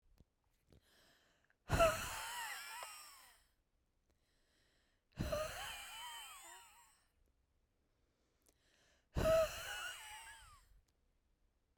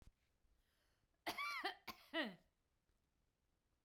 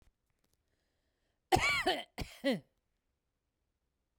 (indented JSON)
{
  "exhalation_length": "11.8 s",
  "exhalation_amplitude": 3085,
  "exhalation_signal_mean_std_ratio": 0.35,
  "three_cough_length": "3.8 s",
  "three_cough_amplitude": 982,
  "three_cough_signal_mean_std_ratio": 0.36,
  "cough_length": "4.2 s",
  "cough_amplitude": 7757,
  "cough_signal_mean_std_ratio": 0.31,
  "survey_phase": "beta (2021-08-13 to 2022-03-07)",
  "age": "45-64",
  "gender": "Female",
  "wearing_mask": "No",
  "symptom_shortness_of_breath": true,
  "symptom_headache": true,
  "symptom_change_to_sense_of_smell_or_taste": true,
  "symptom_onset": "12 days",
  "smoker_status": "Ex-smoker",
  "respiratory_condition_asthma": false,
  "respiratory_condition_other": true,
  "recruitment_source": "REACT",
  "submission_delay": "1 day",
  "covid_test_result": "Negative",
  "covid_test_method": "RT-qPCR",
  "influenza_a_test_result": "Negative",
  "influenza_b_test_result": "Negative"
}